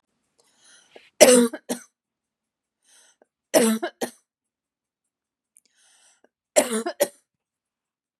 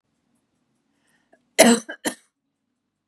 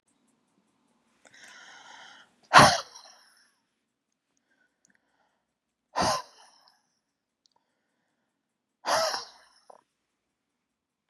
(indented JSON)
{
  "three_cough_length": "8.2 s",
  "three_cough_amplitude": 32768,
  "three_cough_signal_mean_std_ratio": 0.25,
  "cough_length": "3.1 s",
  "cough_amplitude": 32768,
  "cough_signal_mean_std_ratio": 0.22,
  "exhalation_length": "11.1 s",
  "exhalation_amplitude": 27272,
  "exhalation_signal_mean_std_ratio": 0.19,
  "survey_phase": "beta (2021-08-13 to 2022-03-07)",
  "age": "45-64",
  "gender": "Female",
  "wearing_mask": "No",
  "symptom_fatigue": true,
  "symptom_onset": "7 days",
  "smoker_status": "Ex-smoker",
  "respiratory_condition_asthma": false,
  "respiratory_condition_other": false,
  "recruitment_source": "REACT",
  "submission_delay": "1 day",
  "covid_test_result": "Negative",
  "covid_test_method": "RT-qPCR",
  "influenza_a_test_result": "Negative",
  "influenza_b_test_result": "Negative"
}